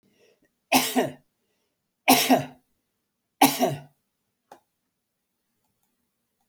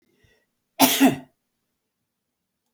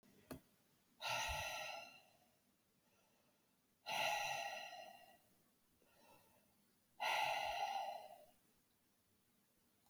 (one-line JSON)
{"three_cough_length": "6.5 s", "three_cough_amplitude": 24798, "three_cough_signal_mean_std_ratio": 0.28, "cough_length": "2.7 s", "cough_amplitude": 27444, "cough_signal_mean_std_ratio": 0.27, "exhalation_length": "9.9 s", "exhalation_amplitude": 1205, "exhalation_signal_mean_std_ratio": 0.48, "survey_phase": "alpha (2021-03-01 to 2021-08-12)", "age": "65+", "gender": "Male", "wearing_mask": "No", "symptom_none": true, "smoker_status": "Never smoked", "respiratory_condition_asthma": false, "respiratory_condition_other": false, "recruitment_source": "REACT", "submission_delay": "1 day", "covid_test_result": "Negative", "covid_test_method": "RT-qPCR"}